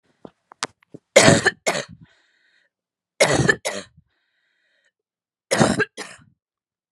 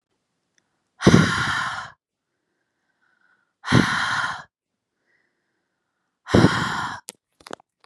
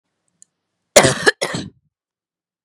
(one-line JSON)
{"three_cough_length": "6.9 s", "three_cough_amplitude": 32768, "three_cough_signal_mean_std_ratio": 0.31, "exhalation_length": "7.9 s", "exhalation_amplitude": 32768, "exhalation_signal_mean_std_ratio": 0.35, "cough_length": "2.6 s", "cough_amplitude": 32768, "cough_signal_mean_std_ratio": 0.27, "survey_phase": "beta (2021-08-13 to 2022-03-07)", "age": "18-44", "gender": "Female", "wearing_mask": "No", "symptom_sore_throat": true, "symptom_fatigue": true, "smoker_status": "Never smoked", "respiratory_condition_asthma": false, "respiratory_condition_other": false, "recruitment_source": "REACT", "submission_delay": "1 day", "covid_test_result": "Negative", "covid_test_method": "RT-qPCR", "influenza_a_test_result": "Negative", "influenza_b_test_result": "Negative"}